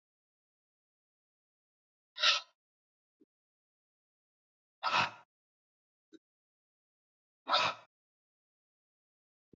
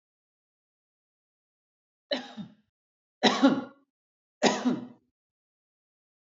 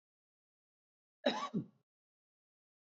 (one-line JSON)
{"exhalation_length": "9.6 s", "exhalation_amplitude": 6783, "exhalation_signal_mean_std_ratio": 0.21, "three_cough_length": "6.4 s", "three_cough_amplitude": 15743, "three_cough_signal_mean_std_ratio": 0.26, "cough_length": "2.9 s", "cough_amplitude": 4089, "cough_signal_mean_std_ratio": 0.24, "survey_phase": "beta (2021-08-13 to 2022-03-07)", "age": "45-64", "gender": "Male", "wearing_mask": "No", "symptom_none": true, "smoker_status": "Ex-smoker", "respiratory_condition_asthma": false, "respiratory_condition_other": false, "recruitment_source": "REACT", "submission_delay": "2 days", "covid_test_result": "Negative", "covid_test_method": "RT-qPCR", "influenza_a_test_result": "Negative", "influenza_b_test_result": "Negative"}